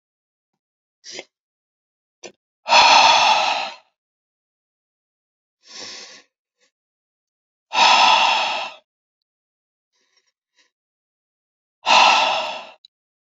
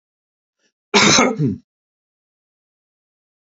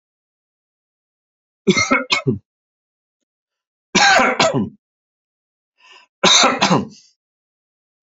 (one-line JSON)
{"exhalation_length": "13.4 s", "exhalation_amplitude": 28831, "exhalation_signal_mean_std_ratio": 0.35, "cough_length": "3.6 s", "cough_amplitude": 30077, "cough_signal_mean_std_ratio": 0.31, "three_cough_length": "8.0 s", "three_cough_amplitude": 32323, "three_cough_signal_mean_std_ratio": 0.37, "survey_phase": "beta (2021-08-13 to 2022-03-07)", "age": "45-64", "gender": "Male", "wearing_mask": "No", "symptom_none": true, "smoker_status": "Never smoked", "respiratory_condition_asthma": false, "respiratory_condition_other": false, "recruitment_source": "REACT", "submission_delay": "2 days", "covid_test_result": "Negative", "covid_test_method": "RT-qPCR", "influenza_a_test_result": "Unknown/Void", "influenza_b_test_result": "Unknown/Void"}